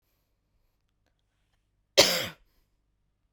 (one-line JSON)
{"cough_length": "3.3 s", "cough_amplitude": 24240, "cough_signal_mean_std_ratio": 0.2, "survey_phase": "beta (2021-08-13 to 2022-03-07)", "age": "18-44", "gender": "Female", "wearing_mask": "No", "symptom_none": true, "smoker_status": "Ex-smoker", "respiratory_condition_asthma": false, "respiratory_condition_other": false, "recruitment_source": "REACT", "submission_delay": "1 day", "covid_test_result": "Negative", "covid_test_method": "RT-qPCR"}